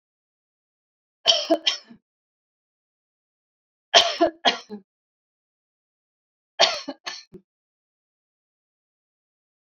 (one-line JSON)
{"three_cough_length": "9.7 s", "three_cough_amplitude": 29136, "three_cough_signal_mean_std_ratio": 0.23, "survey_phase": "beta (2021-08-13 to 2022-03-07)", "age": "45-64", "gender": "Female", "wearing_mask": "No", "symptom_none": true, "smoker_status": "Never smoked", "respiratory_condition_asthma": false, "respiratory_condition_other": false, "recruitment_source": "REACT", "submission_delay": "1 day", "covid_test_result": "Negative", "covid_test_method": "RT-qPCR"}